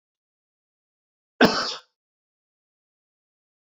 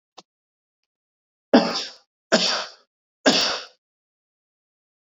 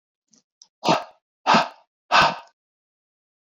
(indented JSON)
{
  "cough_length": "3.7 s",
  "cough_amplitude": 24139,
  "cough_signal_mean_std_ratio": 0.19,
  "three_cough_length": "5.1 s",
  "three_cough_amplitude": 26501,
  "three_cough_signal_mean_std_ratio": 0.31,
  "exhalation_length": "3.5 s",
  "exhalation_amplitude": 22711,
  "exhalation_signal_mean_std_ratio": 0.32,
  "survey_phase": "beta (2021-08-13 to 2022-03-07)",
  "age": "18-44",
  "gender": "Male",
  "wearing_mask": "No",
  "symptom_cough_any": true,
  "symptom_runny_or_blocked_nose": true,
  "symptom_diarrhoea": true,
  "symptom_other": true,
  "smoker_status": "Never smoked",
  "respiratory_condition_asthma": false,
  "respiratory_condition_other": false,
  "recruitment_source": "Test and Trace",
  "submission_delay": "2 days",
  "covid_test_result": "Positive",
  "covid_test_method": "LFT"
}